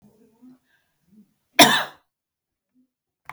cough_length: 3.3 s
cough_amplitude: 32768
cough_signal_mean_std_ratio: 0.2
survey_phase: beta (2021-08-13 to 2022-03-07)
age: 45-64
gender: Female
wearing_mask: 'No'
symptom_none: true
smoker_status: Never smoked
respiratory_condition_asthma: false
respiratory_condition_other: false
recruitment_source: REACT
submission_delay: 2 days
covid_test_result: Negative
covid_test_method: RT-qPCR
influenza_a_test_result: Negative
influenza_b_test_result: Negative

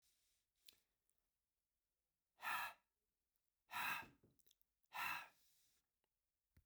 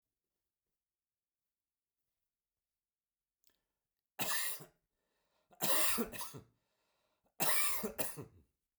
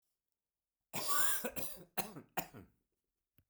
exhalation_length: 6.7 s
exhalation_amplitude: 791
exhalation_signal_mean_std_ratio: 0.32
three_cough_length: 8.8 s
three_cough_amplitude: 4612
three_cough_signal_mean_std_ratio: 0.34
cough_length: 3.5 s
cough_amplitude: 5108
cough_signal_mean_std_ratio: 0.4
survey_phase: beta (2021-08-13 to 2022-03-07)
age: 65+
gender: Male
wearing_mask: 'No'
symptom_none: true
smoker_status: Ex-smoker
respiratory_condition_asthma: false
respiratory_condition_other: false
recruitment_source: REACT
submission_delay: 9 days
covid_test_result: Negative
covid_test_method: RT-qPCR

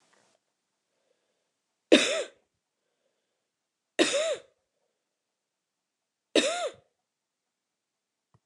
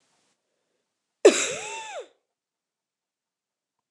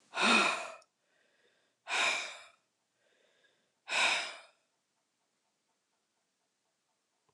three_cough_length: 8.5 s
three_cough_amplitude: 20613
three_cough_signal_mean_std_ratio: 0.24
cough_length: 3.9 s
cough_amplitude: 26675
cough_signal_mean_std_ratio: 0.2
exhalation_length: 7.3 s
exhalation_amplitude: 6359
exhalation_signal_mean_std_ratio: 0.34
survey_phase: beta (2021-08-13 to 2022-03-07)
age: 65+
gender: Female
wearing_mask: 'No'
symptom_none: true
smoker_status: Never smoked
respiratory_condition_asthma: false
respiratory_condition_other: false
recruitment_source: REACT
submission_delay: 2 days
covid_test_result: Negative
covid_test_method: RT-qPCR
influenza_a_test_result: Negative
influenza_b_test_result: Negative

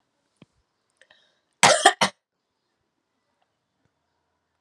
cough_length: 4.6 s
cough_amplitude: 32768
cough_signal_mean_std_ratio: 0.2
survey_phase: alpha (2021-03-01 to 2021-08-12)
age: 45-64
gender: Female
wearing_mask: 'No'
symptom_fatigue: true
symptom_headache: true
symptom_onset: 3 days
smoker_status: Ex-smoker
respiratory_condition_asthma: false
respiratory_condition_other: false
recruitment_source: Test and Trace
submission_delay: 2 days
covid_test_result: Positive
covid_test_method: RT-qPCR
covid_ct_value: 28.6
covid_ct_gene: ORF1ab gene
covid_ct_mean: 28.7
covid_viral_load: 380 copies/ml
covid_viral_load_category: Minimal viral load (< 10K copies/ml)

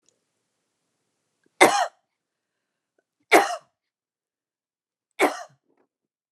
cough_length: 6.3 s
cough_amplitude: 29184
cough_signal_mean_std_ratio: 0.21
survey_phase: alpha (2021-03-01 to 2021-08-12)
age: 45-64
gender: Female
wearing_mask: 'Yes'
symptom_none: true
smoker_status: Never smoked
respiratory_condition_asthma: false
respiratory_condition_other: false
recruitment_source: REACT
submission_delay: 4 days
covid_test_result: Negative
covid_test_method: RT-qPCR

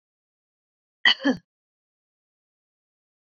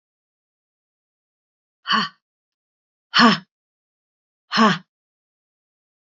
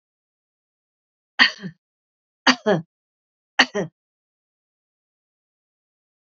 cough_length: 3.2 s
cough_amplitude: 20854
cough_signal_mean_std_ratio: 0.19
exhalation_length: 6.1 s
exhalation_amplitude: 28531
exhalation_signal_mean_std_ratio: 0.24
three_cough_length: 6.4 s
three_cough_amplitude: 28692
three_cough_signal_mean_std_ratio: 0.2
survey_phase: beta (2021-08-13 to 2022-03-07)
age: 45-64
gender: Female
wearing_mask: 'No'
symptom_none: true
smoker_status: Never smoked
respiratory_condition_asthma: false
respiratory_condition_other: false
recruitment_source: REACT
submission_delay: 1 day
covid_test_result: Negative
covid_test_method: RT-qPCR
influenza_a_test_result: Negative
influenza_b_test_result: Negative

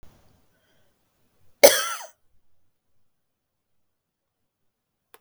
cough_length: 5.2 s
cough_amplitude: 32768
cough_signal_mean_std_ratio: 0.15
survey_phase: beta (2021-08-13 to 2022-03-07)
age: 45-64
gender: Female
wearing_mask: 'No'
symptom_none: true
smoker_status: Ex-smoker
respiratory_condition_asthma: true
respiratory_condition_other: true
recruitment_source: REACT
submission_delay: 2 days
covid_test_result: Negative
covid_test_method: RT-qPCR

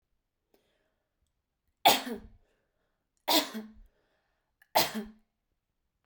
three_cough_length: 6.1 s
three_cough_amplitude: 12543
three_cough_signal_mean_std_ratio: 0.25
survey_phase: beta (2021-08-13 to 2022-03-07)
age: 18-44
gender: Female
wearing_mask: 'No'
symptom_none: true
smoker_status: Current smoker (1 to 10 cigarettes per day)
respiratory_condition_asthma: false
respiratory_condition_other: false
recruitment_source: REACT
submission_delay: 2 days
covid_test_result: Negative
covid_test_method: RT-qPCR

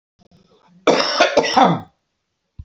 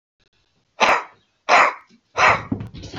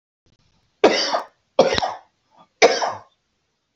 cough_length: 2.6 s
cough_amplitude: 29145
cough_signal_mean_std_ratio: 0.45
exhalation_length: 3.0 s
exhalation_amplitude: 27820
exhalation_signal_mean_std_ratio: 0.42
three_cough_length: 3.8 s
three_cough_amplitude: 27949
three_cough_signal_mean_std_ratio: 0.36
survey_phase: beta (2021-08-13 to 2022-03-07)
age: 45-64
gender: Male
wearing_mask: 'No'
symptom_none: true
smoker_status: Current smoker (11 or more cigarettes per day)
respiratory_condition_asthma: false
respiratory_condition_other: false
recruitment_source: REACT
submission_delay: 2 days
covid_test_result: Negative
covid_test_method: RT-qPCR
influenza_a_test_result: Negative
influenza_b_test_result: Negative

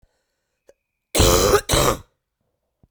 cough_length: 2.9 s
cough_amplitude: 32768
cough_signal_mean_std_ratio: 0.41
survey_phase: beta (2021-08-13 to 2022-03-07)
age: 18-44
gender: Female
wearing_mask: 'No'
symptom_cough_any: true
symptom_runny_or_blocked_nose: true
symptom_fatigue: true
symptom_fever_high_temperature: true
symptom_headache: true
symptom_change_to_sense_of_smell_or_taste: true
symptom_loss_of_taste: true
symptom_onset: 5 days
smoker_status: Ex-smoker
respiratory_condition_asthma: false
respiratory_condition_other: false
recruitment_source: Test and Trace
submission_delay: 2 days
covid_test_result: Positive
covid_test_method: RT-qPCR
covid_ct_value: 22.3
covid_ct_gene: N gene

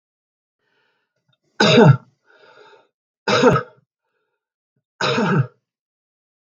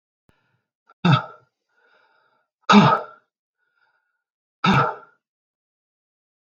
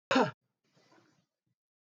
three_cough_length: 6.5 s
three_cough_amplitude: 32151
three_cough_signal_mean_std_ratio: 0.33
exhalation_length: 6.4 s
exhalation_amplitude: 32670
exhalation_signal_mean_std_ratio: 0.27
cough_length: 1.9 s
cough_amplitude: 6794
cough_signal_mean_std_ratio: 0.25
survey_phase: beta (2021-08-13 to 2022-03-07)
age: 45-64
gender: Male
wearing_mask: 'No'
symptom_none: true
smoker_status: Never smoked
respiratory_condition_asthma: false
respiratory_condition_other: false
recruitment_source: REACT
submission_delay: 0 days
covid_test_result: Negative
covid_test_method: RT-qPCR
influenza_a_test_result: Unknown/Void
influenza_b_test_result: Unknown/Void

